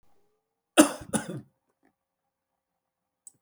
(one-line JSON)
{"cough_length": "3.4 s", "cough_amplitude": 28954, "cough_signal_mean_std_ratio": 0.18, "survey_phase": "beta (2021-08-13 to 2022-03-07)", "age": "45-64", "gender": "Male", "wearing_mask": "No", "symptom_none": true, "symptom_onset": "3 days", "smoker_status": "Ex-smoker", "respiratory_condition_asthma": false, "respiratory_condition_other": false, "recruitment_source": "REACT", "submission_delay": "2 days", "covid_test_result": "Negative", "covid_test_method": "RT-qPCR", "influenza_a_test_result": "Unknown/Void", "influenza_b_test_result": "Unknown/Void"}